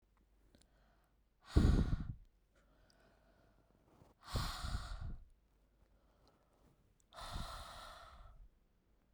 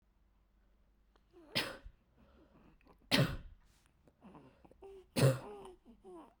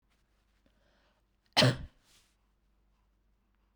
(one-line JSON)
{"exhalation_length": "9.1 s", "exhalation_amplitude": 4838, "exhalation_signal_mean_std_ratio": 0.32, "three_cough_length": "6.4 s", "three_cough_amplitude": 6277, "three_cough_signal_mean_std_ratio": 0.29, "cough_length": "3.8 s", "cough_amplitude": 10155, "cough_signal_mean_std_ratio": 0.2, "survey_phase": "beta (2021-08-13 to 2022-03-07)", "age": "18-44", "gender": "Female", "wearing_mask": "No", "symptom_none": true, "smoker_status": "Never smoked", "respiratory_condition_asthma": false, "respiratory_condition_other": false, "recruitment_source": "REACT", "submission_delay": "3 days", "covid_test_result": "Negative", "covid_test_method": "RT-qPCR", "influenza_a_test_result": "Negative", "influenza_b_test_result": "Negative"}